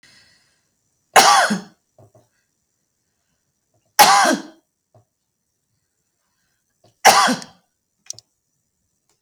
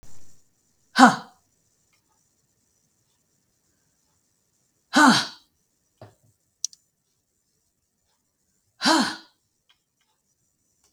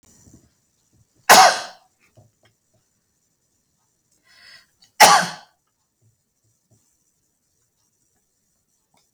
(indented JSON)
{
  "three_cough_length": "9.2 s",
  "three_cough_amplitude": 32768,
  "three_cough_signal_mean_std_ratio": 0.27,
  "exhalation_length": "10.9 s",
  "exhalation_amplitude": 32269,
  "exhalation_signal_mean_std_ratio": 0.21,
  "cough_length": "9.1 s",
  "cough_amplitude": 32768,
  "cough_signal_mean_std_ratio": 0.19,
  "survey_phase": "beta (2021-08-13 to 2022-03-07)",
  "age": "65+",
  "gender": "Female",
  "wearing_mask": "No",
  "symptom_none": true,
  "symptom_onset": "12 days",
  "smoker_status": "Ex-smoker",
  "respiratory_condition_asthma": true,
  "respiratory_condition_other": false,
  "recruitment_source": "REACT",
  "submission_delay": "2 days",
  "covid_test_result": "Negative",
  "covid_test_method": "RT-qPCR",
  "influenza_a_test_result": "Negative",
  "influenza_b_test_result": "Negative"
}